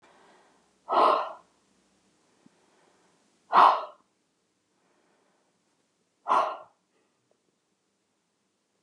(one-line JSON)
{"exhalation_length": "8.8 s", "exhalation_amplitude": 16965, "exhalation_signal_mean_std_ratio": 0.24, "survey_phase": "beta (2021-08-13 to 2022-03-07)", "age": "65+", "gender": "Female", "wearing_mask": "No", "symptom_cough_any": true, "smoker_status": "Never smoked", "respiratory_condition_asthma": false, "respiratory_condition_other": false, "recruitment_source": "REACT", "submission_delay": "1 day", "covid_test_result": "Negative", "covid_test_method": "RT-qPCR", "influenza_a_test_result": "Negative", "influenza_b_test_result": "Negative"}